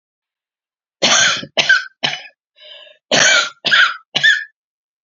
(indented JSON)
{
  "cough_length": "5.0 s",
  "cough_amplitude": 32767,
  "cough_signal_mean_std_ratio": 0.47,
  "survey_phase": "beta (2021-08-13 to 2022-03-07)",
  "age": "45-64",
  "gender": "Female",
  "wearing_mask": "No",
  "symptom_cough_any": true,
  "symptom_runny_or_blocked_nose": true,
  "symptom_fatigue": true,
  "symptom_headache": true,
  "symptom_onset": "7 days",
  "smoker_status": "Ex-smoker",
  "respiratory_condition_asthma": false,
  "respiratory_condition_other": false,
  "recruitment_source": "Test and Trace",
  "submission_delay": "1 day",
  "covid_test_result": "Positive",
  "covid_test_method": "RT-qPCR",
  "covid_ct_value": 26.6,
  "covid_ct_gene": "N gene",
  "covid_ct_mean": 26.8,
  "covid_viral_load": "1600 copies/ml",
  "covid_viral_load_category": "Minimal viral load (< 10K copies/ml)"
}